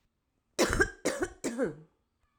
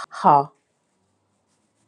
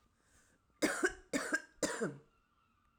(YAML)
cough_length: 2.4 s
cough_amplitude: 8245
cough_signal_mean_std_ratio: 0.45
exhalation_length: 1.9 s
exhalation_amplitude: 25435
exhalation_signal_mean_std_ratio: 0.26
three_cough_length: 3.0 s
three_cough_amplitude: 3645
three_cough_signal_mean_std_ratio: 0.42
survey_phase: alpha (2021-03-01 to 2021-08-12)
age: 45-64
gender: Female
wearing_mask: 'No'
symptom_none: true
smoker_status: Never smoked
respiratory_condition_asthma: true
respiratory_condition_other: false
recruitment_source: REACT
submission_delay: 2 days
covid_test_result: Negative
covid_test_method: RT-qPCR